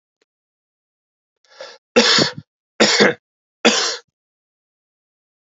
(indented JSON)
{
  "three_cough_length": "5.5 s",
  "three_cough_amplitude": 31375,
  "three_cough_signal_mean_std_ratio": 0.33,
  "survey_phase": "beta (2021-08-13 to 2022-03-07)",
  "age": "18-44",
  "gender": "Male",
  "wearing_mask": "No",
  "symptom_cough_any": true,
  "symptom_runny_or_blocked_nose": true,
  "symptom_fatigue": true,
  "symptom_fever_high_temperature": true,
  "symptom_headache": true,
  "symptom_other": true,
  "smoker_status": "Never smoked",
  "respiratory_condition_asthma": false,
  "respiratory_condition_other": false,
  "recruitment_source": "Test and Trace",
  "submission_delay": "1 day",
  "covid_test_result": "Positive",
  "covid_test_method": "LAMP"
}